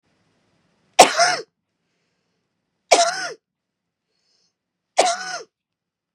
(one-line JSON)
{"three_cough_length": "6.1 s", "three_cough_amplitude": 32768, "three_cough_signal_mean_std_ratio": 0.27, "survey_phase": "beta (2021-08-13 to 2022-03-07)", "age": "45-64", "gender": "Female", "wearing_mask": "No", "symptom_none": true, "smoker_status": "Never smoked", "respiratory_condition_asthma": false, "respiratory_condition_other": true, "recruitment_source": "REACT", "submission_delay": "2 days", "covid_test_result": "Negative", "covid_test_method": "RT-qPCR", "influenza_a_test_result": "Negative", "influenza_b_test_result": "Negative"}